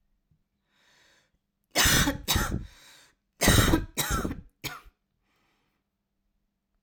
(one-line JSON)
{"cough_length": "6.8 s", "cough_amplitude": 15277, "cough_signal_mean_std_ratio": 0.37, "survey_phase": "alpha (2021-03-01 to 2021-08-12)", "age": "18-44", "gender": "Female", "wearing_mask": "No", "symptom_new_continuous_cough": true, "symptom_onset": "6 days", "smoker_status": "Never smoked", "respiratory_condition_asthma": false, "respiratory_condition_other": false, "recruitment_source": "REACT", "submission_delay": "2 days", "covid_test_result": "Negative", "covid_test_method": "RT-qPCR"}